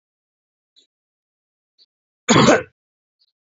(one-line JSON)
{"cough_length": "3.6 s", "cough_amplitude": 28610, "cough_signal_mean_std_ratio": 0.24, "survey_phase": "alpha (2021-03-01 to 2021-08-12)", "age": "45-64", "gender": "Male", "wearing_mask": "No", "symptom_none": true, "smoker_status": "Ex-smoker", "respiratory_condition_asthma": false, "respiratory_condition_other": false, "recruitment_source": "REACT", "submission_delay": "2 days", "covid_test_result": "Negative", "covid_test_method": "RT-qPCR"}